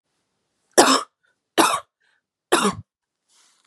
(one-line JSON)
{"three_cough_length": "3.7 s", "three_cough_amplitude": 32767, "three_cough_signal_mean_std_ratio": 0.32, "survey_phase": "beta (2021-08-13 to 2022-03-07)", "age": "18-44", "gender": "Female", "wearing_mask": "No", "symptom_cough_any": true, "symptom_new_continuous_cough": true, "symptom_shortness_of_breath": true, "smoker_status": "Never smoked", "respiratory_condition_asthma": false, "respiratory_condition_other": false, "recruitment_source": "Test and Trace", "submission_delay": "1 day", "covid_test_result": "Positive", "covid_test_method": "RT-qPCR", "covid_ct_value": 25.1, "covid_ct_gene": "N gene"}